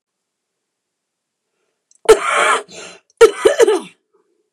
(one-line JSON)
{"cough_length": "4.5 s", "cough_amplitude": 29204, "cough_signal_mean_std_ratio": 0.34, "survey_phase": "beta (2021-08-13 to 2022-03-07)", "age": "18-44", "gender": "Female", "wearing_mask": "No", "symptom_new_continuous_cough": true, "symptom_runny_or_blocked_nose": true, "symptom_sore_throat": true, "symptom_fatigue": true, "symptom_headache": true, "symptom_onset": "2 days", "smoker_status": "Ex-smoker", "respiratory_condition_asthma": false, "respiratory_condition_other": false, "recruitment_source": "Test and Trace", "submission_delay": "1 day", "covid_test_result": "Positive", "covid_test_method": "RT-qPCR", "covid_ct_value": 25.0, "covid_ct_gene": "ORF1ab gene"}